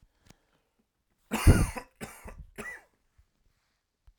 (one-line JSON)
{"cough_length": "4.2 s", "cough_amplitude": 15549, "cough_signal_mean_std_ratio": 0.23, "survey_phase": "alpha (2021-03-01 to 2021-08-12)", "age": "45-64", "gender": "Male", "wearing_mask": "No", "symptom_none": true, "smoker_status": "Ex-smoker", "respiratory_condition_asthma": false, "respiratory_condition_other": false, "recruitment_source": "REACT", "submission_delay": "1 day", "covid_test_result": "Negative", "covid_test_method": "RT-qPCR"}